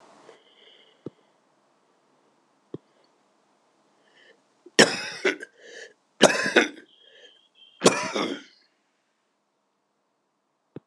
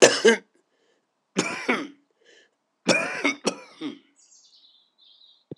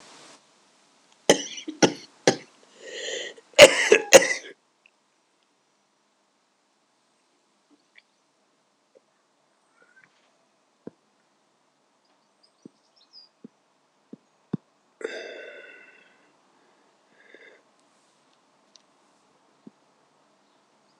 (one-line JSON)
{"cough_length": "10.9 s", "cough_amplitude": 26028, "cough_signal_mean_std_ratio": 0.23, "three_cough_length": "5.6 s", "three_cough_amplitude": 26028, "three_cough_signal_mean_std_ratio": 0.33, "exhalation_length": "21.0 s", "exhalation_amplitude": 26028, "exhalation_signal_mean_std_ratio": 0.16, "survey_phase": "alpha (2021-03-01 to 2021-08-12)", "age": "65+", "gender": "Male", "wearing_mask": "No", "symptom_cough_any": true, "symptom_diarrhoea": true, "smoker_status": "Ex-smoker", "respiratory_condition_asthma": false, "respiratory_condition_other": false, "recruitment_source": "Test and Trace", "submission_delay": "1 day", "covid_test_result": "Positive", "covid_test_method": "RT-qPCR", "covid_ct_value": 14.6, "covid_ct_gene": "ORF1ab gene", "covid_ct_mean": 15.1, "covid_viral_load": "11000000 copies/ml", "covid_viral_load_category": "High viral load (>1M copies/ml)"}